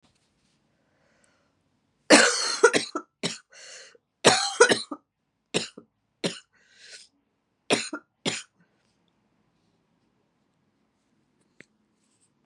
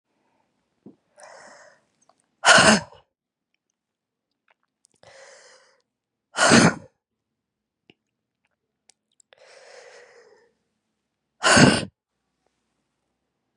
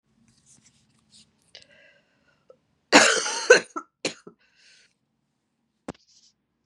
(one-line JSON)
{"three_cough_length": "12.5 s", "three_cough_amplitude": 29607, "three_cough_signal_mean_std_ratio": 0.25, "exhalation_length": "13.6 s", "exhalation_amplitude": 30854, "exhalation_signal_mean_std_ratio": 0.23, "cough_length": "6.7 s", "cough_amplitude": 31548, "cough_signal_mean_std_ratio": 0.21, "survey_phase": "beta (2021-08-13 to 2022-03-07)", "age": "18-44", "gender": "Female", "wearing_mask": "No", "symptom_cough_any": true, "symptom_new_continuous_cough": true, "symptom_shortness_of_breath": true, "symptom_abdominal_pain": true, "symptom_fatigue": true, "symptom_headache": true, "symptom_onset": "3 days", "smoker_status": "Current smoker (1 to 10 cigarettes per day)", "respiratory_condition_asthma": false, "respiratory_condition_other": false, "recruitment_source": "Test and Trace", "submission_delay": "2 days", "covid_test_result": "Positive", "covid_test_method": "RT-qPCR", "covid_ct_value": 20.5, "covid_ct_gene": "ORF1ab gene", "covid_ct_mean": 20.8, "covid_viral_load": "150000 copies/ml", "covid_viral_load_category": "Low viral load (10K-1M copies/ml)"}